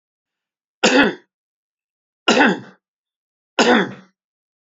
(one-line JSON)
{"three_cough_length": "4.6 s", "three_cough_amplitude": 29655, "three_cough_signal_mean_std_ratio": 0.35, "survey_phase": "beta (2021-08-13 to 2022-03-07)", "age": "65+", "gender": "Male", "wearing_mask": "No", "symptom_none": true, "smoker_status": "Never smoked", "respiratory_condition_asthma": false, "respiratory_condition_other": false, "recruitment_source": "REACT", "submission_delay": "1 day", "covid_test_result": "Negative", "covid_test_method": "RT-qPCR", "influenza_a_test_result": "Negative", "influenza_b_test_result": "Negative"}